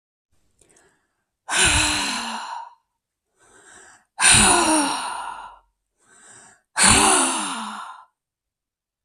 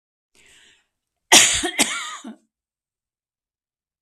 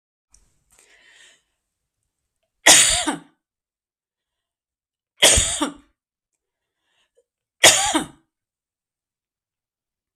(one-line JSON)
{"exhalation_length": "9.0 s", "exhalation_amplitude": 32164, "exhalation_signal_mean_std_ratio": 0.45, "cough_length": "4.0 s", "cough_amplitude": 32768, "cough_signal_mean_std_ratio": 0.28, "three_cough_length": "10.2 s", "three_cough_amplitude": 32768, "three_cough_signal_mean_std_ratio": 0.25, "survey_phase": "beta (2021-08-13 to 2022-03-07)", "age": "65+", "gender": "Female", "wearing_mask": "No", "symptom_none": true, "smoker_status": "Ex-smoker", "respiratory_condition_asthma": false, "respiratory_condition_other": false, "recruitment_source": "REACT", "submission_delay": "1 day", "covid_test_result": "Negative", "covid_test_method": "RT-qPCR", "influenza_a_test_result": "Negative", "influenza_b_test_result": "Negative"}